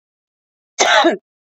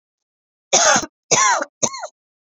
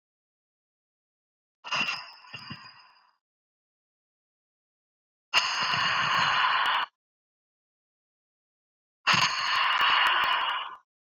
{
  "cough_length": "1.5 s",
  "cough_amplitude": 32768,
  "cough_signal_mean_std_ratio": 0.4,
  "three_cough_length": "2.5 s",
  "three_cough_amplitude": 28982,
  "three_cough_signal_mean_std_ratio": 0.45,
  "exhalation_length": "11.1 s",
  "exhalation_amplitude": 12333,
  "exhalation_signal_mean_std_ratio": 0.48,
  "survey_phase": "beta (2021-08-13 to 2022-03-07)",
  "age": "18-44",
  "gender": "Female",
  "wearing_mask": "No",
  "symptom_sore_throat": true,
  "symptom_headache": true,
  "symptom_onset": "6 days",
  "smoker_status": "Ex-smoker",
  "respiratory_condition_asthma": false,
  "respiratory_condition_other": false,
  "recruitment_source": "REACT",
  "submission_delay": "1 day",
  "covid_test_result": "Negative",
  "covid_test_method": "RT-qPCR"
}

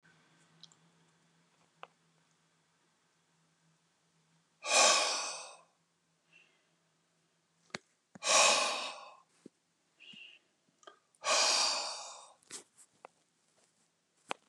{
  "exhalation_length": "14.5 s",
  "exhalation_amplitude": 7686,
  "exhalation_signal_mean_std_ratio": 0.31,
  "survey_phase": "beta (2021-08-13 to 2022-03-07)",
  "age": "65+",
  "gender": "Male",
  "wearing_mask": "No",
  "symptom_none": true,
  "smoker_status": "Ex-smoker",
  "respiratory_condition_asthma": false,
  "respiratory_condition_other": false,
  "recruitment_source": "REACT",
  "submission_delay": "1 day",
  "covid_test_result": "Negative",
  "covid_test_method": "RT-qPCR"
}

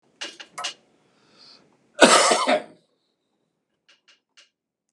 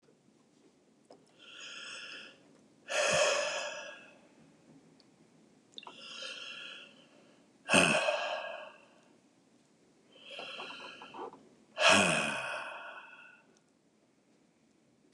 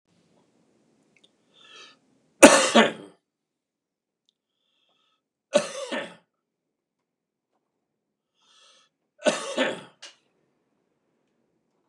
{
  "cough_length": "4.9 s",
  "cough_amplitude": 32767,
  "cough_signal_mean_std_ratio": 0.28,
  "exhalation_length": "15.1 s",
  "exhalation_amplitude": 13179,
  "exhalation_signal_mean_std_ratio": 0.39,
  "three_cough_length": "11.9 s",
  "three_cough_amplitude": 32768,
  "three_cough_signal_mean_std_ratio": 0.19,
  "survey_phase": "beta (2021-08-13 to 2022-03-07)",
  "age": "65+",
  "gender": "Male",
  "wearing_mask": "No",
  "symptom_none": true,
  "smoker_status": "Never smoked",
  "respiratory_condition_asthma": false,
  "respiratory_condition_other": false,
  "recruitment_source": "REACT",
  "submission_delay": "2 days",
  "covid_test_result": "Negative",
  "covid_test_method": "RT-qPCR",
  "influenza_a_test_result": "Negative",
  "influenza_b_test_result": "Negative"
}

